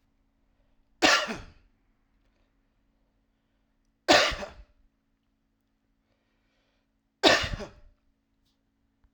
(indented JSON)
{
  "three_cough_length": "9.1 s",
  "three_cough_amplitude": 21397,
  "three_cough_signal_mean_std_ratio": 0.24,
  "survey_phase": "alpha (2021-03-01 to 2021-08-12)",
  "age": "18-44",
  "gender": "Male",
  "wearing_mask": "No",
  "symptom_none": true,
  "smoker_status": "Never smoked",
  "respiratory_condition_asthma": false,
  "respiratory_condition_other": false,
  "recruitment_source": "REACT",
  "submission_delay": "2 days",
  "covid_test_result": "Negative",
  "covid_test_method": "RT-qPCR"
}